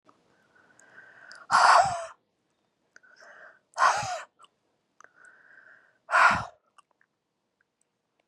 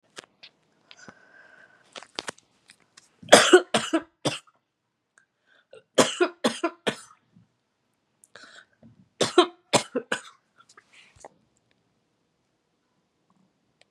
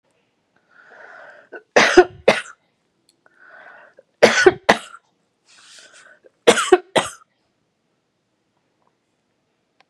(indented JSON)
{
  "exhalation_length": "8.3 s",
  "exhalation_amplitude": 15817,
  "exhalation_signal_mean_std_ratio": 0.3,
  "cough_length": "13.9 s",
  "cough_amplitude": 32768,
  "cough_signal_mean_std_ratio": 0.22,
  "three_cough_length": "9.9 s",
  "three_cough_amplitude": 32768,
  "three_cough_signal_mean_std_ratio": 0.25,
  "survey_phase": "beta (2021-08-13 to 2022-03-07)",
  "age": "65+",
  "gender": "Female",
  "wearing_mask": "No",
  "symptom_none": true,
  "smoker_status": "Current smoker (e-cigarettes or vapes only)",
  "respiratory_condition_asthma": false,
  "respiratory_condition_other": false,
  "recruitment_source": "REACT",
  "submission_delay": "5 days",
  "covid_test_result": "Negative",
  "covid_test_method": "RT-qPCR"
}